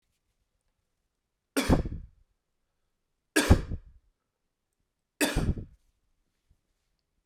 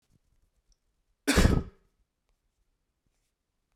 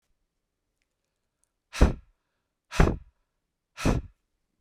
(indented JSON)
{
  "three_cough_length": "7.3 s",
  "three_cough_amplitude": 18026,
  "three_cough_signal_mean_std_ratio": 0.26,
  "cough_length": "3.8 s",
  "cough_amplitude": 14655,
  "cough_signal_mean_std_ratio": 0.23,
  "exhalation_length": "4.6 s",
  "exhalation_amplitude": 23781,
  "exhalation_signal_mean_std_ratio": 0.24,
  "survey_phase": "beta (2021-08-13 to 2022-03-07)",
  "age": "18-44",
  "gender": "Male",
  "wearing_mask": "No",
  "symptom_cough_any": true,
  "symptom_runny_or_blocked_nose": true,
  "symptom_shortness_of_breath": true,
  "symptom_abdominal_pain": true,
  "symptom_fatigue": true,
  "symptom_onset": "3 days",
  "smoker_status": "Current smoker (e-cigarettes or vapes only)",
  "respiratory_condition_asthma": false,
  "respiratory_condition_other": false,
  "recruitment_source": "Test and Trace",
  "submission_delay": "2 days",
  "covid_test_result": "Positive",
  "covid_test_method": "RT-qPCR",
  "covid_ct_value": 22.2,
  "covid_ct_gene": "ORF1ab gene",
  "covid_ct_mean": 22.5,
  "covid_viral_load": "43000 copies/ml",
  "covid_viral_load_category": "Low viral load (10K-1M copies/ml)"
}